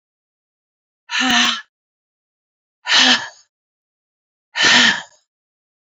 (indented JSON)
{
  "exhalation_length": "6.0 s",
  "exhalation_amplitude": 32768,
  "exhalation_signal_mean_std_ratio": 0.37,
  "survey_phase": "beta (2021-08-13 to 2022-03-07)",
  "age": "45-64",
  "gender": "Female",
  "wearing_mask": "No",
  "symptom_cough_any": true,
  "symptom_runny_or_blocked_nose": true,
  "symptom_loss_of_taste": true,
  "symptom_other": true,
  "symptom_onset": "3 days",
  "smoker_status": "Ex-smoker",
  "respiratory_condition_asthma": false,
  "respiratory_condition_other": false,
  "recruitment_source": "Test and Trace",
  "submission_delay": "1 day",
  "covid_test_result": "Positive",
  "covid_test_method": "RT-qPCR",
  "covid_ct_value": 18.5,
  "covid_ct_gene": "N gene"
}